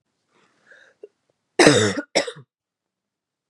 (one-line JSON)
{"cough_length": "3.5 s", "cough_amplitude": 32768, "cough_signal_mean_std_ratio": 0.28, "survey_phase": "beta (2021-08-13 to 2022-03-07)", "age": "18-44", "gender": "Female", "wearing_mask": "No", "symptom_cough_any": true, "symptom_runny_or_blocked_nose": true, "symptom_sore_throat": true, "symptom_diarrhoea": true, "symptom_fatigue": true, "symptom_other": true, "smoker_status": "Ex-smoker", "respiratory_condition_asthma": false, "respiratory_condition_other": false, "recruitment_source": "Test and Trace", "submission_delay": "1 day", "covid_test_result": "Positive", "covid_test_method": "RT-qPCR", "covid_ct_value": 23.3, "covid_ct_gene": "N gene"}